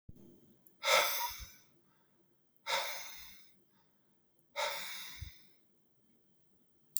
{"exhalation_length": "7.0 s", "exhalation_amplitude": 12188, "exhalation_signal_mean_std_ratio": 0.38, "survey_phase": "beta (2021-08-13 to 2022-03-07)", "age": "45-64", "gender": "Male", "wearing_mask": "No", "symptom_none": true, "smoker_status": "Ex-smoker", "respiratory_condition_asthma": false, "respiratory_condition_other": false, "recruitment_source": "Test and Trace", "submission_delay": "1 day", "covid_test_result": "Negative", "covid_test_method": "RT-qPCR"}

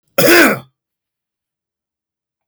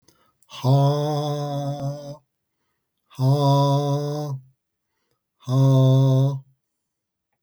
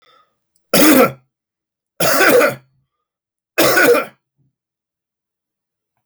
{"cough_length": "2.5 s", "cough_amplitude": 32768, "cough_signal_mean_std_ratio": 0.34, "exhalation_length": "7.4 s", "exhalation_amplitude": 13128, "exhalation_signal_mean_std_ratio": 0.62, "three_cough_length": "6.1 s", "three_cough_amplitude": 32768, "three_cough_signal_mean_std_ratio": 0.41, "survey_phase": "beta (2021-08-13 to 2022-03-07)", "age": "45-64", "gender": "Male", "wearing_mask": "No", "symptom_cough_any": true, "symptom_runny_or_blocked_nose": true, "symptom_sore_throat": true, "symptom_fever_high_temperature": true, "symptom_headache": true, "smoker_status": "Never smoked", "respiratory_condition_asthma": false, "respiratory_condition_other": false, "recruitment_source": "Test and Trace", "submission_delay": "2 days", "covid_test_result": "Positive", "covid_test_method": "RT-qPCR", "covid_ct_value": 27.5, "covid_ct_gene": "ORF1ab gene", "covid_ct_mean": 28.1, "covid_viral_load": "620 copies/ml", "covid_viral_load_category": "Minimal viral load (< 10K copies/ml)"}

